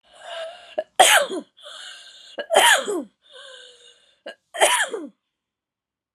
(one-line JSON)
{"three_cough_length": "6.1 s", "three_cough_amplitude": 32564, "three_cough_signal_mean_std_ratio": 0.38, "survey_phase": "alpha (2021-03-01 to 2021-08-12)", "age": "45-64", "gender": "Female", "wearing_mask": "No", "symptom_none": true, "smoker_status": "Never smoked", "respiratory_condition_asthma": false, "respiratory_condition_other": true, "recruitment_source": "REACT", "submission_delay": "1 day", "covid_test_result": "Negative", "covid_test_method": "RT-qPCR"}